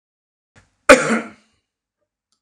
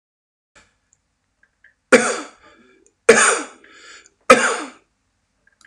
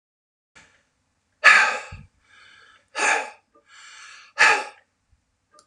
cough_length: 2.4 s
cough_amplitude: 32768
cough_signal_mean_std_ratio: 0.23
three_cough_length: 5.7 s
three_cough_amplitude: 32768
three_cough_signal_mean_std_ratio: 0.28
exhalation_length: 5.7 s
exhalation_amplitude: 31749
exhalation_signal_mean_std_ratio: 0.3
survey_phase: alpha (2021-03-01 to 2021-08-12)
age: 65+
gender: Male
wearing_mask: 'No'
symptom_none: true
smoker_status: Ex-smoker
respiratory_condition_asthma: false
respiratory_condition_other: false
recruitment_source: REACT
submission_delay: 2 days
covid_test_result: Negative
covid_test_method: RT-qPCR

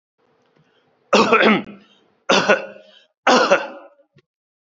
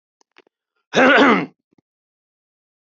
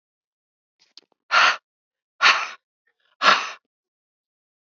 three_cough_length: 4.7 s
three_cough_amplitude: 32484
three_cough_signal_mean_std_ratio: 0.41
cough_length: 2.8 s
cough_amplitude: 32388
cough_signal_mean_std_ratio: 0.34
exhalation_length: 4.8 s
exhalation_amplitude: 26695
exhalation_signal_mean_std_ratio: 0.29
survey_phase: beta (2021-08-13 to 2022-03-07)
age: 45-64
gender: Male
wearing_mask: 'No'
symptom_cough_any: true
smoker_status: Current smoker (1 to 10 cigarettes per day)
respiratory_condition_asthma: false
respiratory_condition_other: false
recruitment_source: REACT
submission_delay: 1 day
covid_test_result: Negative
covid_test_method: RT-qPCR
influenza_a_test_result: Negative
influenza_b_test_result: Negative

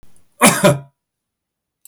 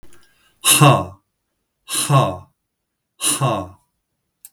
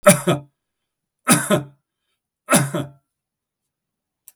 cough_length: 1.9 s
cough_amplitude: 32768
cough_signal_mean_std_ratio: 0.34
exhalation_length: 4.5 s
exhalation_amplitude: 32768
exhalation_signal_mean_std_ratio: 0.4
three_cough_length: 4.4 s
three_cough_amplitude: 32768
three_cough_signal_mean_std_ratio: 0.32
survey_phase: beta (2021-08-13 to 2022-03-07)
age: 65+
gender: Male
wearing_mask: 'No'
symptom_none: true
smoker_status: Ex-smoker
respiratory_condition_asthma: false
respiratory_condition_other: false
recruitment_source: REACT
submission_delay: 4 days
covid_test_result: Negative
covid_test_method: RT-qPCR
influenza_a_test_result: Negative
influenza_b_test_result: Negative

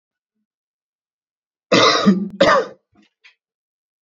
cough_length: 4.0 s
cough_amplitude: 31624
cough_signal_mean_std_ratio: 0.36
survey_phase: beta (2021-08-13 to 2022-03-07)
age: 18-44
gender: Male
wearing_mask: 'No'
symptom_none: true
smoker_status: Never smoked
respiratory_condition_asthma: false
respiratory_condition_other: false
recruitment_source: REACT
submission_delay: 5 days
covid_test_result: Negative
covid_test_method: RT-qPCR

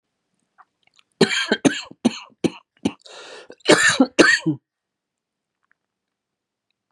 cough_length: 6.9 s
cough_amplitude: 32767
cough_signal_mean_std_ratio: 0.32
survey_phase: beta (2021-08-13 to 2022-03-07)
age: 45-64
gender: Male
wearing_mask: 'No'
symptom_cough_any: true
symptom_new_continuous_cough: true
symptom_runny_or_blocked_nose: true
symptom_fatigue: true
symptom_fever_high_temperature: true
symptom_headache: true
symptom_change_to_sense_of_smell_or_taste: true
symptom_loss_of_taste: true
symptom_onset: 3 days
smoker_status: Never smoked
respiratory_condition_asthma: false
respiratory_condition_other: false
recruitment_source: Test and Trace
submission_delay: 2 days
covid_test_result: Positive
covid_test_method: RT-qPCR
covid_ct_value: 26.0
covid_ct_gene: ORF1ab gene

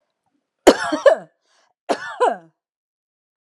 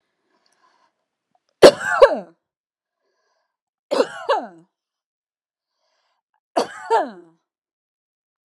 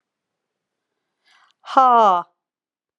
cough_length: 3.4 s
cough_amplitude: 32768
cough_signal_mean_std_ratio: 0.29
three_cough_length: 8.4 s
three_cough_amplitude: 32768
three_cough_signal_mean_std_ratio: 0.22
exhalation_length: 3.0 s
exhalation_amplitude: 30855
exhalation_signal_mean_std_ratio: 0.31
survey_phase: beta (2021-08-13 to 2022-03-07)
age: 45-64
gender: Female
wearing_mask: 'No'
symptom_none: true
smoker_status: Ex-smoker
respiratory_condition_asthma: false
respiratory_condition_other: false
recruitment_source: REACT
submission_delay: 6 days
covid_test_result: Negative
covid_test_method: RT-qPCR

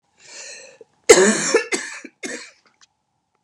cough_length: 3.4 s
cough_amplitude: 32768
cough_signal_mean_std_ratio: 0.33
survey_phase: beta (2021-08-13 to 2022-03-07)
age: 45-64
gender: Female
wearing_mask: 'No'
symptom_none: true
smoker_status: Never smoked
respiratory_condition_asthma: false
respiratory_condition_other: false
recruitment_source: REACT
submission_delay: 2 days
covid_test_result: Negative
covid_test_method: RT-qPCR
influenza_a_test_result: Negative
influenza_b_test_result: Negative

